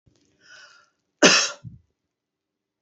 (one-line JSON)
{"cough_length": "2.8 s", "cough_amplitude": 29706, "cough_signal_mean_std_ratio": 0.24, "survey_phase": "beta (2021-08-13 to 2022-03-07)", "age": "45-64", "gender": "Female", "wearing_mask": "No", "symptom_none": true, "smoker_status": "Never smoked", "respiratory_condition_asthma": false, "respiratory_condition_other": false, "recruitment_source": "REACT", "submission_delay": "31 days", "covid_test_result": "Negative", "covid_test_method": "RT-qPCR", "influenza_a_test_result": "Unknown/Void", "influenza_b_test_result": "Unknown/Void"}